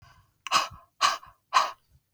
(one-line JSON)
{"exhalation_length": "2.1 s", "exhalation_amplitude": 14565, "exhalation_signal_mean_std_ratio": 0.37, "survey_phase": "beta (2021-08-13 to 2022-03-07)", "age": "45-64", "gender": "Female", "wearing_mask": "No", "symptom_none": true, "smoker_status": "Never smoked", "respiratory_condition_asthma": false, "respiratory_condition_other": false, "recruitment_source": "REACT", "submission_delay": "1 day", "covid_test_result": "Negative", "covid_test_method": "RT-qPCR"}